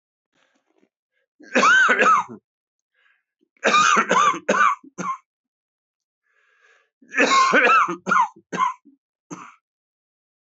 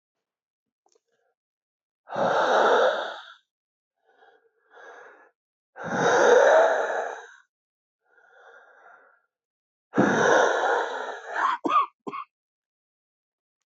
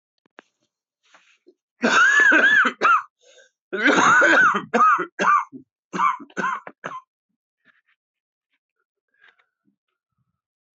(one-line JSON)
{"three_cough_length": "10.6 s", "three_cough_amplitude": 22989, "three_cough_signal_mean_std_ratio": 0.45, "exhalation_length": "13.7 s", "exhalation_amplitude": 17126, "exhalation_signal_mean_std_ratio": 0.44, "cough_length": "10.8 s", "cough_amplitude": 20848, "cough_signal_mean_std_ratio": 0.45, "survey_phase": "alpha (2021-03-01 to 2021-08-12)", "age": "45-64", "gender": "Male", "wearing_mask": "No", "symptom_cough_any": true, "symptom_new_continuous_cough": true, "symptom_shortness_of_breath": true, "symptom_fatigue": true, "symptom_fever_high_temperature": true, "symptom_headache": true, "symptom_change_to_sense_of_smell_or_taste": true, "symptom_onset": "4 days", "smoker_status": "Ex-smoker", "respiratory_condition_asthma": true, "respiratory_condition_other": false, "recruitment_source": "Test and Trace", "submission_delay": "1 day", "covid_test_result": "Positive", "covid_test_method": "RT-qPCR"}